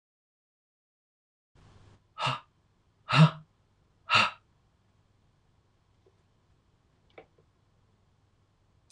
{"exhalation_length": "8.9 s", "exhalation_amplitude": 12355, "exhalation_signal_mean_std_ratio": 0.19, "survey_phase": "beta (2021-08-13 to 2022-03-07)", "age": "18-44", "gender": "Male", "wearing_mask": "No", "symptom_new_continuous_cough": true, "symptom_runny_or_blocked_nose": true, "symptom_sore_throat": true, "symptom_diarrhoea": true, "symptom_fatigue": true, "symptom_headache": true, "symptom_onset": "2 days", "smoker_status": "Never smoked", "respiratory_condition_asthma": false, "respiratory_condition_other": false, "recruitment_source": "Test and Trace", "submission_delay": "1 day", "covid_test_result": "Positive", "covid_test_method": "RT-qPCR", "covid_ct_value": 23.5, "covid_ct_gene": "N gene"}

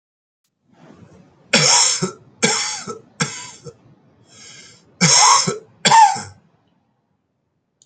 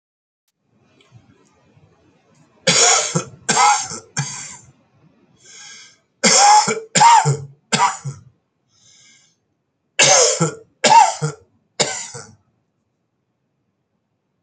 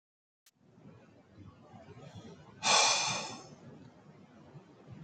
{"cough_length": "7.9 s", "cough_amplitude": 31247, "cough_signal_mean_std_ratio": 0.4, "three_cough_length": "14.4 s", "three_cough_amplitude": 32767, "three_cough_signal_mean_std_ratio": 0.39, "exhalation_length": "5.0 s", "exhalation_amplitude": 7511, "exhalation_signal_mean_std_ratio": 0.36, "survey_phase": "beta (2021-08-13 to 2022-03-07)", "age": "65+", "gender": "Male", "wearing_mask": "No", "symptom_cough_any": true, "symptom_runny_or_blocked_nose": true, "symptom_change_to_sense_of_smell_or_taste": true, "symptom_loss_of_taste": true, "symptom_onset": "3 days", "smoker_status": "Ex-smoker", "respiratory_condition_asthma": false, "respiratory_condition_other": false, "recruitment_source": "Test and Trace", "submission_delay": "2 days", "covid_test_result": "Positive", "covid_test_method": "RT-qPCR", "covid_ct_value": 18.4, "covid_ct_gene": "ORF1ab gene", "covid_ct_mean": 18.8, "covid_viral_load": "710000 copies/ml", "covid_viral_load_category": "Low viral load (10K-1M copies/ml)"}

